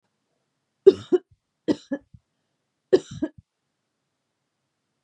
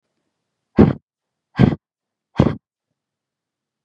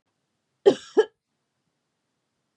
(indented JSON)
{
  "three_cough_length": "5.0 s",
  "three_cough_amplitude": 28909,
  "three_cough_signal_mean_std_ratio": 0.18,
  "exhalation_length": "3.8 s",
  "exhalation_amplitude": 32768,
  "exhalation_signal_mean_std_ratio": 0.24,
  "cough_length": "2.6 s",
  "cough_amplitude": 21714,
  "cough_signal_mean_std_ratio": 0.19,
  "survey_phase": "beta (2021-08-13 to 2022-03-07)",
  "age": "18-44",
  "gender": "Female",
  "wearing_mask": "No",
  "symptom_none": true,
  "smoker_status": "Ex-smoker",
  "respiratory_condition_asthma": false,
  "respiratory_condition_other": false,
  "recruitment_source": "REACT",
  "submission_delay": "5 days",
  "covid_test_result": "Negative",
  "covid_test_method": "RT-qPCR",
  "influenza_a_test_result": "Negative",
  "influenza_b_test_result": "Negative"
}